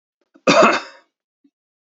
{
  "cough_length": "2.0 s",
  "cough_amplitude": 30428,
  "cough_signal_mean_std_ratio": 0.33,
  "survey_phase": "beta (2021-08-13 to 2022-03-07)",
  "age": "65+",
  "gender": "Male",
  "wearing_mask": "No",
  "symptom_cough_any": true,
  "symptom_sore_throat": true,
  "smoker_status": "Never smoked",
  "respiratory_condition_asthma": false,
  "respiratory_condition_other": false,
  "recruitment_source": "REACT",
  "submission_delay": "1 day",
  "covid_test_result": "Negative",
  "covid_test_method": "RT-qPCR",
  "influenza_a_test_result": "Negative",
  "influenza_b_test_result": "Negative"
}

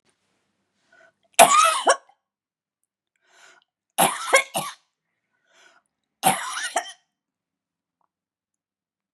{
  "three_cough_length": "9.1 s",
  "three_cough_amplitude": 32768,
  "three_cough_signal_mean_std_ratio": 0.27,
  "survey_phase": "beta (2021-08-13 to 2022-03-07)",
  "age": "65+",
  "gender": "Female",
  "wearing_mask": "No",
  "symptom_abdominal_pain": true,
  "symptom_fatigue": true,
  "symptom_headache": true,
  "smoker_status": "Never smoked",
  "respiratory_condition_asthma": false,
  "respiratory_condition_other": false,
  "recruitment_source": "Test and Trace",
  "submission_delay": "3 days",
  "covid_test_result": "Positive",
  "covid_test_method": "RT-qPCR",
  "covid_ct_value": 30.1,
  "covid_ct_gene": "ORF1ab gene"
}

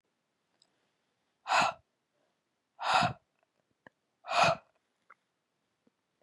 {
  "exhalation_length": "6.2 s",
  "exhalation_amplitude": 7495,
  "exhalation_signal_mean_std_ratio": 0.28,
  "survey_phase": "beta (2021-08-13 to 2022-03-07)",
  "age": "18-44",
  "gender": "Female",
  "wearing_mask": "No",
  "symptom_cough_any": true,
  "symptom_sore_throat": true,
  "smoker_status": "Never smoked",
  "respiratory_condition_asthma": false,
  "respiratory_condition_other": false,
  "recruitment_source": "REACT",
  "submission_delay": "1 day",
  "covid_test_result": "Negative",
  "covid_test_method": "RT-qPCR",
  "covid_ct_value": 39.0,
  "covid_ct_gene": "N gene",
  "influenza_a_test_result": "Negative",
  "influenza_b_test_result": "Negative"
}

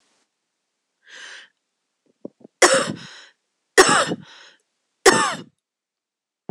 {
  "three_cough_length": "6.5 s",
  "three_cough_amplitude": 26028,
  "three_cough_signal_mean_std_ratio": 0.28,
  "survey_phase": "beta (2021-08-13 to 2022-03-07)",
  "age": "45-64",
  "gender": "Female",
  "wearing_mask": "No",
  "symptom_cough_any": true,
  "symptom_runny_or_blocked_nose": true,
  "symptom_headache": true,
  "symptom_onset": "3 days",
  "smoker_status": "Never smoked",
  "respiratory_condition_asthma": false,
  "respiratory_condition_other": false,
  "recruitment_source": "Test and Trace",
  "submission_delay": "1 day",
  "covid_test_result": "Positive",
  "covid_test_method": "RT-qPCR",
  "covid_ct_value": 21.4,
  "covid_ct_gene": "ORF1ab gene",
  "covid_ct_mean": 21.6,
  "covid_viral_load": "83000 copies/ml",
  "covid_viral_load_category": "Low viral load (10K-1M copies/ml)"
}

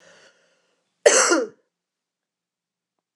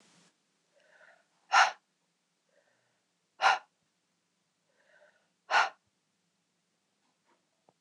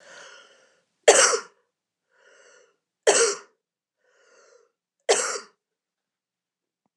{
  "cough_length": "3.2 s",
  "cough_amplitude": 26028,
  "cough_signal_mean_std_ratio": 0.27,
  "exhalation_length": "7.8 s",
  "exhalation_amplitude": 9557,
  "exhalation_signal_mean_std_ratio": 0.2,
  "three_cough_length": "7.0 s",
  "three_cough_amplitude": 25541,
  "three_cough_signal_mean_std_ratio": 0.26,
  "survey_phase": "beta (2021-08-13 to 2022-03-07)",
  "age": "45-64",
  "gender": "Female",
  "wearing_mask": "No",
  "symptom_new_continuous_cough": true,
  "symptom_runny_or_blocked_nose": true,
  "symptom_change_to_sense_of_smell_or_taste": true,
  "symptom_onset": "3 days",
  "smoker_status": "Ex-smoker",
  "respiratory_condition_asthma": true,
  "respiratory_condition_other": false,
  "recruitment_source": "Test and Trace",
  "submission_delay": "1 day",
  "covid_test_result": "Positive",
  "covid_test_method": "RT-qPCR"
}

